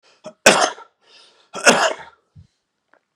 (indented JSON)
{
  "cough_length": "3.2 s",
  "cough_amplitude": 32768,
  "cough_signal_mean_std_ratio": 0.32,
  "survey_phase": "beta (2021-08-13 to 2022-03-07)",
  "age": "45-64",
  "gender": "Male",
  "wearing_mask": "No",
  "symptom_none": true,
  "smoker_status": "Never smoked",
  "respiratory_condition_asthma": false,
  "respiratory_condition_other": false,
  "recruitment_source": "REACT",
  "submission_delay": "1 day",
  "covid_test_result": "Negative",
  "covid_test_method": "RT-qPCR",
  "influenza_a_test_result": "Negative",
  "influenza_b_test_result": "Negative"
}